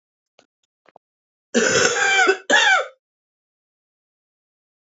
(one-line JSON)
{"cough_length": "4.9 s", "cough_amplitude": 29296, "cough_signal_mean_std_ratio": 0.4, "survey_phase": "beta (2021-08-13 to 2022-03-07)", "age": "45-64", "gender": "Female", "wearing_mask": "No", "symptom_cough_any": true, "symptom_runny_or_blocked_nose": true, "symptom_shortness_of_breath": true, "symptom_abdominal_pain": true, "symptom_diarrhoea": true, "symptom_fatigue": true, "symptom_other": true, "symptom_onset": "5 days", "smoker_status": "Ex-smoker", "respiratory_condition_asthma": false, "respiratory_condition_other": false, "recruitment_source": "Test and Trace", "submission_delay": "2 days", "covid_test_result": "Positive", "covid_test_method": "RT-qPCR", "covid_ct_value": 27.2, "covid_ct_gene": "ORF1ab gene", "covid_ct_mean": 27.6, "covid_viral_load": "880 copies/ml", "covid_viral_load_category": "Minimal viral load (< 10K copies/ml)"}